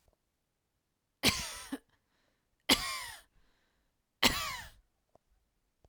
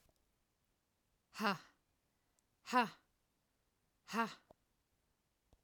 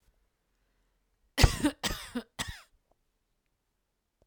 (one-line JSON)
{"three_cough_length": "5.9 s", "three_cough_amplitude": 13446, "three_cough_signal_mean_std_ratio": 0.28, "exhalation_length": "5.6 s", "exhalation_amplitude": 3568, "exhalation_signal_mean_std_ratio": 0.24, "cough_length": "4.3 s", "cough_amplitude": 17272, "cough_signal_mean_std_ratio": 0.23, "survey_phase": "alpha (2021-03-01 to 2021-08-12)", "age": "18-44", "gender": "Female", "wearing_mask": "No", "symptom_none": true, "smoker_status": "Never smoked", "respiratory_condition_asthma": false, "respiratory_condition_other": false, "recruitment_source": "REACT", "submission_delay": "2 days", "covid_test_result": "Negative", "covid_test_method": "RT-qPCR"}